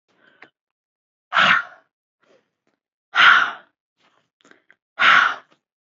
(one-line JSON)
{"exhalation_length": "6.0 s", "exhalation_amplitude": 27823, "exhalation_signal_mean_std_ratio": 0.32, "survey_phase": "alpha (2021-03-01 to 2021-08-12)", "age": "18-44", "gender": "Female", "wearing_mask": "No", "symptom_none": true, "smoker_status": "Never smoked", "respiratory_condition_asthma": false, "respiratory_condition_other": false, "recruitment_source": "REACT", "submission_delay": "1 day", "covid_test_result": "Negative", "covid_test_method": "RT-qPCR"}